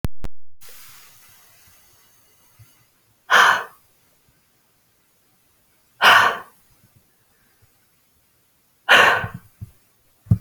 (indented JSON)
{
  "exhalation_length": "10.4 s",
  "exhalation_amplitude": 30128,
  "exhalation_signal_mean_std_ratio": 0.32,
  "survey_phase": "beta (2021-08-13 to 2022-03-07)",
  "age": "45-64",
  "gender": "Female",
  "wearing_mask": "No",
  "symptom_runny_or_blocked_nose": true,
  "smoker_status": "Never smoked",
  "respiratory_condition_asthma": false,
  "respiratory_condition_other": false,
  "recruitment_source": "REACT",
  "submission_delay": "1 day",
  "covid_test_result": "Negative",
  "covid_test_method": "RT-qPCR"
}